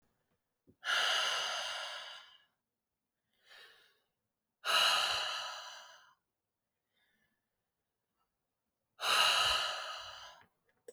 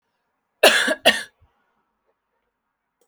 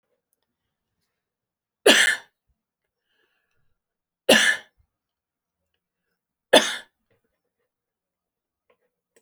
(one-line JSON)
{"exhalation_length": "10.9 s", "exhalation_amplitude": 5457, "exhalation_signal_mean_std_ratio": 0.43, "cough_length": "3.1 s", "cough_amplitude": 31651, "cough_signal_mean_std_ratio": 0.28, "three_cough_length": "9.2 s", "three_cough_amplitude": 30826, "three_cough_signal_mean_std_ratio": 0.21, "survey_phase": "beta (2021-08-13 to 2022-03-07)", "age": "18-44", "gender": "Female", "wearing_mask": "No", "symptom_none": true, "smoker_status": "Ex-smoker", "respiratory_condition_asthma": false, "respiratory_condition_other": false, "recruitment_source": "REACT", "submission_delay": "5 days", "covid_test_result": "Negative", "covid_test_method": "RT-qPCR"}